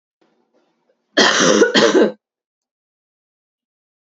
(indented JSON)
{
  "cough_length": "4.0 s",
  "cough_amplitude": 32768,
  "cough_signal_mean_std_ratio": 0.39,
  "survey_phase": "beta (2021-08-13 to 2022-03-07)",
  "age": "45-64",
  "gender": "Female",
  "wearing_mask": "No",
  "symptom_cough_any": true,
  "symptom_runny_or_blocked_nose": true,
  "symptom_fatigue": true,
  "symptom_other": true,
  "symptom_onset": "5 days",
  "smoker_status": "Current smoker (e-cigarettes or vapes only)",
  "respiratory_condition_asthma": true,
  "respiratory_condition_other": false,
  "recruitment_source": "Test and Trace",
  "submission_delay": "1 day",
  "covid_test_result": "Positive",
  "covid_test_method": "RT-qPCR",
  "covid_ct_value": 21.1,
  "covid_ct_gene": "ORF1ab gene"
}